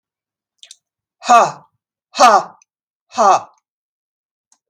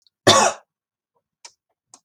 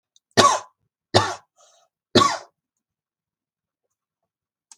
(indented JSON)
{
  "exhalation_length": "4.7 s",
  "exhalation_amplitude": 32768,
  "exhalation_signal_mean_std_ratio": 0.31,
  "cough_length": "2.0 s",
  "cough_amplitude": 32767,
  "cough_signal_mean_std_ratio": 0.28,
  "three_cough_length": "4.8 s",
  "three_cough_amplitude": 32768,
  "three_cough_signal_mean_std_ratio": 0.26,
  "survey_phase": "beta (2021-08-13 to 2022-03-07)",
  "age": "45-64",
  "gender": "Female",
  "wearing_mask": "No",
  "symptom_none": true,
  "smoker_status": "Never smoked",
  "respiratory_condition_asthma": false,
  "respiratory_condition_other": false,
  "recruitment_source": "REACT",
  "submission_delay": "2 days",
  "covid_test_result": "Negative",
  "covid_test_method": "RT-qPCR",
  "influenza_a_test_result": "Negative",
  "influenza_b_test_result": "Negative"
}